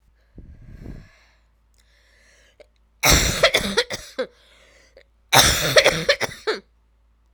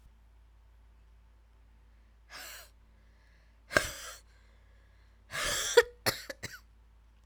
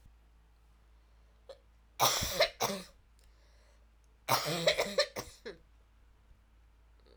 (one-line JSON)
{"cough_length": "7.3 s", "cough_amplitude": 32768, "cough_signal_mean_std_ratio": 0.38, "exhalation_length": "7.3 s", "exhalation_amplitude": 23102, "exhalation_signal_mean_std_ratio": 0.27, "three_cough_length": "7.2 s", "three_cough_amplitude": 8076, "three_cough_signal_mean_std_ratio": 0.37, "survey_phase": "alpha (2021-03-01 to 2021-08-12)", "age": "45-64", "gender": "Female", "wearing_mask": "No", "symptom_new_continuous_cough": true, "symptom_shortness_of_breath": true, "symptom_fatigue": true, "symptom_fever_high_temperature": true, "symptom_change_to_sense_of_smell_or_taste": true, "symptom_loss_of_taste": true, "symptom_onset": "3 days", "smoker_status": "Never smoked", "respiratory_condition_asthma": false, "respiratory_condition_other": false, "recruitment_source": "Test and Trace", "submission_delay": "1 day", "covid_test_result": "Positive", "covid_test_method": "RT-qPCR"}